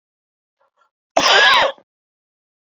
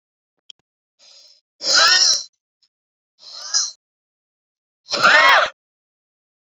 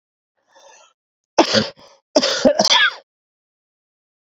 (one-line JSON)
{"cough_length": "2.6 s", "cough_amplitude": 28486, "cough_signal_mean_std_ratio": 0.38, "exhalation_length": "6.5 s", "exhalation_amplitude": 27976, "exhalation_signal_mean_std_ratio": 0.36, "three_cough_length": "4.4 s", "three_cough_amplitude": 30691, "three_cough_signal_mean_std_ratio": 0.36, "survey_phase": "beta (2021-08-13 to 2022-03-07)", "age": "18-44", "gender": "Male", "wearing_mask": "No", "symptom_none": true, "smoker_status": "Never smoked", "respiratory_condition_asthma": false, "respiratory_condition_other": false, "recruitment_source": "REACT", "submission_delay": "0 days", "covid_test_result": "Negative", "covid_test_method": "RT-qPCR"}